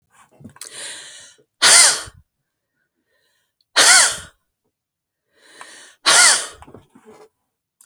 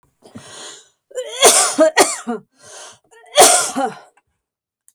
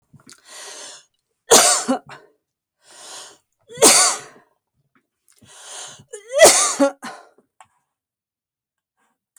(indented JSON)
{
  "exhalation_length": "7.9 s",
  "exhalation_amplitude": 32768,
  "exhalation_signal_mean_std_ratio": 0.32,
  "cough_length": "4.9 s",
  "cough_amplitude": 32768,
  "cough_signal_mean_std_ratio": 0.41,
  "three_cough_length": "9.4 s",
  "three_cough_amplitude": 32768,
  "three_cough_signal_mean_std_ratio": 0.31,
  "survey_phase": "beta (2021-08-13 to 2022-03-07)",
  "age": "45-64",
  "gender": "Female",
  "wearing_mask": "No",
  "symptom_none": true,
  "smoker_status": "Never smoked",
  "respiratory_condition_asthma": false,
  "respiratory_condition_other": false,
  "recruitment_source": "REACT",
  "submission_delay": "1 day",
  "covid_test_result": "Negative",
  "covid_test_method": "RT-qPCR"
}